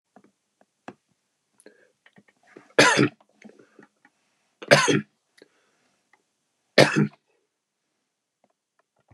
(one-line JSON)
{"three_cough_length": "9.1 s", "three_cough_amplitude": 31938, "three_cough_signal_mean_std_ratio": 0.23, "survey_phase": "beta (2021-08-13 to 2022-03-07)", "age": "65+", "gender": "Male", "wearing_mask": "No", "symptom_none": true, "smoker_status": "Never smoked", "respiratory_condition_asthma": false, "respiratory_condition_other": false, "recruitment_source": "REACT", "submission_delay": "2 days", "covid_test_result": "Negative", "covid_test_method": "RT-qPCR", "influenza_a_test_result": "Negative", "influenza_b_test_result": "Negative"}